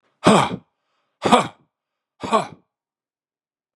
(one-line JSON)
{"exhalation_length": "3.8 s", "exhalation_amplitude": 32767, "exhalation_signal_mean_std_ratio": 0.31, "survey_phase": "beta (2021-08-13 to 2022-03-07)", "age": "65+", "gender": "Male", "wearing_mask": "No", "symptom_runny_or_blocked_nose": true, "smoker_status": "Ex-smoker", "respiratory_condition_asthma": false, "respiratory_condition_other": false, "recruitment_source": "Test and Trace", "submission_delay": "2 days", "covid_test_result": "Negative", "covid_test_method": "RT-qPCR"}